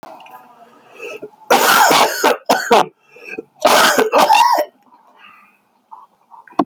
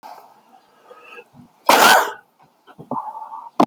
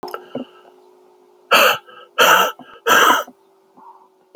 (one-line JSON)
{"three_cough_length": "6.7 s", "three_cough_amplitude": 32767, "three_cough_signal_mean_std_ratio": 0.51, "cough_length": "3.7 s", "cough_amplitude": 30664, "cough_signal_mean_std_ratio": 0.34, "exhalation_length": "4.4 s", "exhalation_amplitude": 32446, "exhalation_signal_mean_std_ratio": 0.42, "survey_phase": "alpha (2021-03-01 to 2021-08-12)", "age": "18-44", "gender": "Male", "wearing_mask": "No", "symptom_cough_any": true, "symptom_shortness_of_breath": true, "symptom_diarrhoea": true, "symptom_fatigue": true, "symptom_fever_high_temperature": true, "symptom_headache": true, "symptom_change_to_sense_of_smell_or_taste": true, "symptom_loss_of_taste": true, "symptom_onset": "2 days", "smoker_status": "Never smoked", "respiratory_condition_asthma": false, "respiratory_condition_other": false, "recruitment_source": "Test and Trace", "submission_delay": "2 days", "covid_test_result": "Positive", "covid_test_method": "RT-qPCR", "covid_ct_value": 11.2, "covid_ct_gene": "ORF1ab gene", "covid_ct_mean": 11.5, "covid_viral_load": "170000000 copies/ml", "covid_viral_load_category": "High viral load (>1M copies/ml)"}